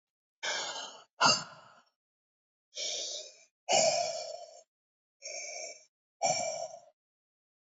{
  "exhalation_length": "7.8 s",
  "exhalation_amplitude": 8495,
  "exhalation_signal_mean_std_ratio": 0.42,
  "survey_phase": "alpha (2021-03-01 to 2021-08-12)",
  "age": "45-64",
  "gender": "Female",
  "wearing_mask": "No",
  "symptom_cough_any": true,
  "symptom_fatigue": true,
  "symptom_fever_high_temperature": true,
  "symptom_headache": true,
  "symptom_onset": "3 days",
  "smoker_status": "Never smoked",
  "respiratory_condition_asthma": false,
  "respiratory_condition_other": false,
  "recruitment_source": "Test and Trace",
  "submission_delay": "1 day",
  "covid_test_result": "Positive",
  "covid_test_method": "RT-qPCR"
}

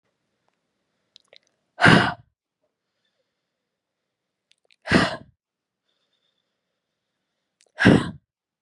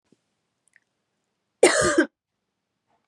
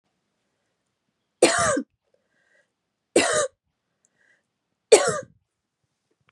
{
  "exhalation_length": "8.6 s",
  "exhalation_amplitude": 32605,
  "exhalation_signal_mean_std_ratio": 0.22,
  "cough_length": "3.1 s",
  "cough_amplitude": 27592,
  "cough_signal_mean_std_ratio": 0.27,
  "three_cough_length": "6.3 s",
  "three_cough_amplitude": 31684,
  "three_cough_signal_mean_std_ratio": 0.27,
  "survey_phase": "beta (2021-08-13 to 2022-03-07)",
  "age": "18-44",
  "gender": "Female",
  "wearing_mask": "No",
  "symptom_fatigue": true,
  "symptom_headache": true,
  "symptom_other": true,
  "symptom_onset": "3 days",
  "smoker_status": "Never smoked",
  "respiratory_condition_asthma": false,
  "respiratory_condition_other": false,
  "recruitment_source": "Test and Trace",
  "submission_delay": "2 days",
  "covid_test_result": "Negative",
  "covid_test_method": "RT-qPCR"
}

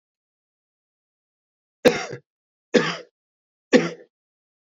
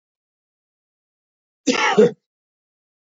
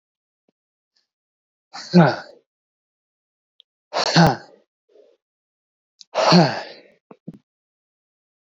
{
  "three_cough_length": "4.8 s",
  "three_cough_amplitude": 25268,
  "three_cough_signal_mean_std_ratio": 0.23,
  "cough_length": "3.2 s",
  "cough_amplitude": 26409,
  "cough_signal_mean_std_ratio": 0.27,
  "exhalation_length": "8.4 s",
  "exhalation_amplitude": 26363,
  "exhalation_signal_mean_std_ratio": 0.27,
  "survey_phase": "beta (2021-08-13 to 2022-03-07)",
  "age": "18-44",
  "gender": "Male",
  "wearing_mask": "No",
  "symptom_fatigue": true,
  "symptom_headache": true,
  "smoker_status": "Never smoked",
  "respiratory_condition_asthma": false,
  "respiratory_condition_other": false,
  "recruitment_source": "Test and Trace",
  "submission_delay": "2 days",
  "covid_test_result": "Positive",
  "covid_test_method": "LFT"
}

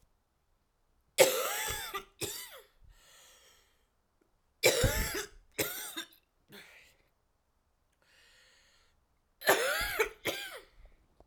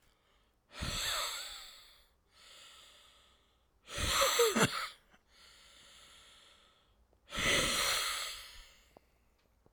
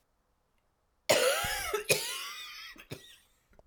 {
  "three_cough_length": "11.3 s",
  "three_cough_amplitude": 15027,
  "three_cough_signal_mean_std_ratio": 0.35,
  "exhalation_length": "9.7 s",
  "exhalation_amplitude": 7631,
  "exhalation_signal_mean_std_ratio": 0.45,
  "cough_length": "3.7 s",
  "cough_amplitude": 14528,
  "cough_signal_mean_std_ratio": 0.45,
  "survey_phase": "beta (2021-08-13 to 2022-03-07)",
  "age": "18-44",
  "gender": "Female",
  "wearing_mask": "No",
  "symptom_cough_any": true,
  "symptom_shortness_of_breath": true,
  "symptom_sore_throat": true,
  "symptom_abdominal_pain": true,
  "symptom_headache": true,
  "symptom_onset": "3 days",
  "smoker_status": "Current smoker (e-cigarettes or vapes only)",
  "respiratory_condition_asthma": false,
  "respiratory_condition_other": false,
  "recruitment_source": "Test and Trace",
  "submission_delay": "1 day",
  "covid_test_result": "Positive",
  "covid_test_method": "RT-qPCR",
  "covid_ct_value": 29.2,
  "covid_ct_gene": "ORF1ab gene",
  "covid_ct_mean": 30.8,
  "covid_viral_load": "81 copies/ml",
  "covid_viral_load_category": "Minimal viral load (< 10K copies/ml)"
}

